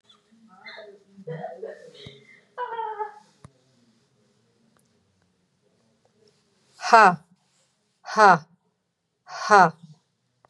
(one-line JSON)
{"exhalation_length": "10.5 s", "exhalation_amplitude": 29868, "exhalation_signal_mean_std_ratio": 0.24, "survey_phase": "beta (2021-08-13 to 2022-03-07)", "age": "65+", "gender": "Female", "wearing_mask": "No", "symptom_none": true, "smoker_status": "Never smoked", "respiratory_condition_asthma": false, "respiratory_condition_other": false, "recruitment_source": "REACT", "submission_delay": "2 days", "covid_test_result": "Negative", "covid_test_method": "RT-qPCR", "influenza_a_test_result": "Negative", "influenza_b_test_result": "Negative"}